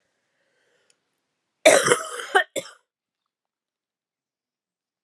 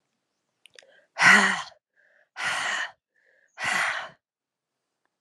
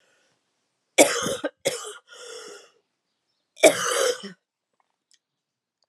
{"cough_length": "5.0 s", "cough_amplitude": 30823, "cough_signal_mean_std_ratio": 0.24, "exhalation_length": "5.2 s", "exhalation_amplitude": 23636, "exhalation_signal_mean_std_ratio": 0.35, "three_cough_length": "5.9 s", "three_cough_amplitude": 29956, "three_cough_signal_mean_std_ratio": 0.3, "survey_phase": "beta (2021-08-13 to 2022-03-07)", "age": "18-44", "gender": "Female", "wearing_mask": "No", "symptom_cough_any": true, "symptom_runny_or_blocked_nose": true, "symptom_sore_throat": true, "symptom_fatigue": true, "symptom_fever_high_temperature": true, "symptom_headache": true, "symptom_change_to_sense_of_smell_or_taste": true, "symptom_loss_of_taste": true, "smoker_status": "Never smoked", "respiratory_condition_asthma": false, "respiratory_condition_other": false, "recruitment_source": "Test and Trace", "submission_delay": "2 days", "covid_test_result": "Positive", "covid_test_method": "ePCR"}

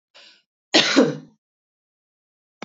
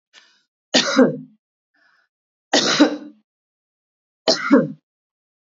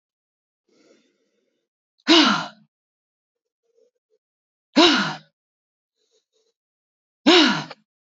{"cough_length": "2.6 s", "cough_amplitude": 27162, "cough_signal_mean_std_ratio": 0.3, "three_cough_length": "5.5 s", "three_cough_amplitude": 28847, "three_cough_signal_mean_std_ratio": 0.35, "exhalation_length": "8.2 s", "exhalation_amplitude": 28017, "exhalation_signal_mean_std_ratio": 0.28, "survey_phase": "beta (2021-08-13 to 2022-03-07)", "age": "65+", "gender": "Female", "wearing_mask": "No", "symptom_none": true, "smoker_status": "Ex-smoker", "respiratory_condition_asthma": false, "respiratory_condition_other": false, "recruitment_source": "REACT", "submission_delay": "2 days", "covid_test_result": "Negative", "covid_test_method": "RT-qPCR", "influenza_a_test_result": "Negative", "influenza_b_test_result": "Negative"}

